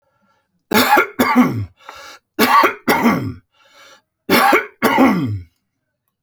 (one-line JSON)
{"three_cough_length": "6.2 s", "three_cough_amplitude": 32685, "three_cough_signal_mean_std_ratio": 0.54, "survey_phase": "alpha (2021-03-01 to 2021-08-12)", "age": "65+", "gender": "Male", "wearing_mask": "No", "symptom_none": true, "smoker_status": "Ex-smoker", "respiratory_condition_asthma": false, "respiratory_condition_other": false, "recruitment_source": "REACT", "submission_delay": "1 day", "covid_test_result": "Negative", "covid_test_method": "RT-qPCR"}